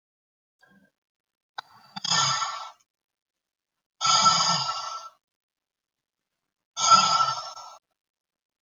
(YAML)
exhalation_length: 8.6 s
exhalation_amplitude: 20052
exhalation_signal_mean_std_ratio: 0.38
survey_phase: beta (2021-08-13 to 2022-03-07)
age: 45-64
gender: Female
wearing_mask: 'No'
symptom_change_to_sense_of_smell_or_taste: true
symptom_loss_of_taste: true
smoker_status: Never smoked
respiratory_condition_asthma: false
respiratory_condition_other: false
recruitment_source: REACT
submission_delay: 2 days
covid_test_result: Negative
covid_test_method: RT-qPCR